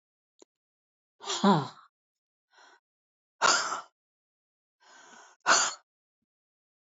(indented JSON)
{
  "exhalation_length": "6.8 s",
  "exhalation_amplitude": 11245,
  "exhalation_signal_mean_std_ratio": 0.28,
  "survey_phase": "alpha (2021-03-01 to 2021-08-12)",
  "age": "65+",
  "gender": "Female",
  "wearing_mask": "No",
  "symptom_none": true,
  "smoker_status": "Ex-smoker",
  "respiratory_condition_asthma": false,
  "respiratory_condition_other": false,
  "recruitment_source": "REACT",
  "submission_delay": "2 days",
  "covid_test_result": "Negative",
  "covid_test_method": "RT-qPCR"
}